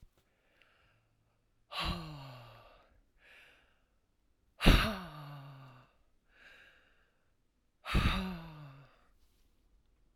{"exhalation_length": "10.2 s", "exhalation_amplitude": 10859, "exhalation_signal_mean_std_ratio": 0.27, "survey_phase": "alpha (2021-03-01 to 2021-08-12)", "age": "45-64", "gender": "Female", "wearing_mask": "No", "symptom_shortness_of_breath": true, "symptom_fatigue": true, "symptom_headache": true, "smoker_status": "Ex-smoker", "respiratory_condition_asthma": true, "respiratory_condition_other": false, "recruitment_source": "Test and Trace", "submission_delay": "2 days", "covid_test_result": "Positive", "covid_test_method": "RT-qPCR", "covid_ct_value": 37.4, "covid_ct_gene": "ORF1ab gene"}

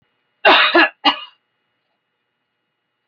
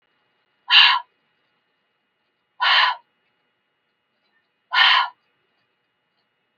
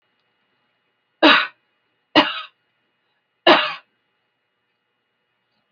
{"cough_length": "3.1 s", "cough_amplitude": 30035, "cough_signal_mean_std_ratio": 0.34, "exhalation_length": "6.6 s", "exhalation_amplitude": 28125, "exhalation_signal_mean_std_ratio": 0.3, "three_cough_length": "5.7 s", "three_cough_amplitude": 29767, "three_cough_signal_mean_std_ratio": 0.25, "survey_phase": "alpha (2021-03-01 to 2021-08-12)", "age": "65+", "gender": "Female", "wearing_mask": "No", "symptom_none": true, "smoker_status": "Never smoked", "respiratory_condition_asthma": false, "respiratory_condition_other": false, "recruitment_source": "REACT", "submission_delay": "3 days", "covid_test_result": "Negative", "covid_test_method": "RT-qPCR"}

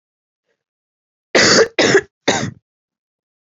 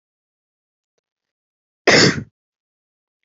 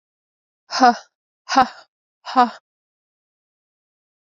{"three_cough_length": "3.4 s", "three_cough_amplitude": 31054, "three_cough_signal_mean_std_ratio": 0.37, "cough_length": "3.2 s", "cough_amplitude": 31950, "cough_signal_mean_std_ratio": 0.24, "exhalation_length": "4.4 s", "exhalation_amplitude": 29375, "exhalation_signal_mean_std_ratio": 0.25, "survey_phase": "beta (2021-08-13 to 2022-03-07)", "age": "18-44", "gender": "Female", "wearing_mask": "No", "symptom_fatigue": true, "symptom_headache": true, "smoker_status": "Never smoked", "respiratory_condition_asthma": true, "respiratory_condition_other": false, "recruitment_source": "REACT", "submission_delay": "1 day", "covid_test_result": "Negative", "covid_test_method": "RT-qPCR", "influenza_a_test_result": "Unknown/Void", "influenza_b_test_result": "Unknown/Void"}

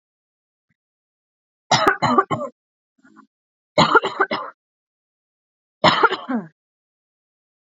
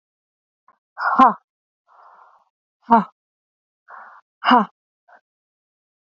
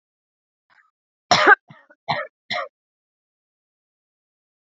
{"three_cough_length": "7.8 s", "three_cough_amplitude": 30513, "three_cough_signal_mean_std_ratio": 0.32, "exhalation_length": "6.1 s", "exhalation_amplitude": 27732, "exhalation_signal_mean_std_ratio": 0.24, "cough_length": "4.8 s", "cough_amplitude": 30974, "cough_signal_mean_std_ratio": 0.22, "survey_phase": "beta (2021-08-13 to 2022-03-07)", "age": "18-44", "gender": "Female", "wearing_mask": "No", "symptom_none": true, "smoker_status": "Never smoked", "respiratory_condition_asthma": false, "respiratory_condition_other": false, "recruitment_source": "REACT", "submission_delay": "1 day", "covid_test_result": "Negative", "covid_test_method": "RT-qPCR", "influenza_a_test_result": "Negative", "influenza_b_test_result": "Negative"}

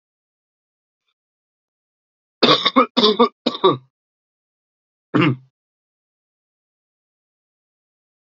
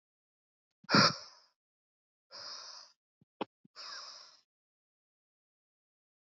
{"cough_length": "8.3 s", "cough_amplitude": 30234, "cough_signal_mean_std_ratio": 0.26, "exhalation_length": "6.4 s", "exhalation_amplitude": 9813, "exhalation_signal_mean_std_ratio": 0.2, "survey_phase": "alpha (2021-03-01 to 2021-08-12)", "age": "18-44", "gender": "Male", "wearing_mask": "No", "symptom_cough_any": true, "symptom_onset": "4 days", "smoker_status": "Never smoked", "respiratory_condition_asthma": false, "respiratory_condition_other": false, "recruitment_source": "Test and Trace", "submission_delay": "2 days", "covid_test_result": "Positive", "covid_test_method": "RT-qPCR"}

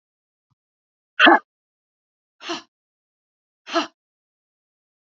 {"exhalation_length": "5.0 s", "exhalation_amplitude": 30105, "exhalation_signal_mean_std_ratio": 0.2, "survey_phase": "beta (2021-08-13 to 2022-03-07)", "age": "45-64", "gender": "Female", "wearing_mask": "No", "symptom_cough_any": true, "symptom_new_continuous_cough": true, "symptom_runny_or_blocked_nose": true, "symptom_shortness_of_breath": true, "symptom_sore_throat": true, "symptom_fatigue": true, "symptom_onset": "4 days", "smoker_status": "Never smoked", "respiratory_condition_asthma": false, "respiratory_condition_other": false, "recruitment_source": "Test and Trace", "submission_delay": "1 day", "covid_test_result": "Negative", "covid_test_method": "RT-qPCR"}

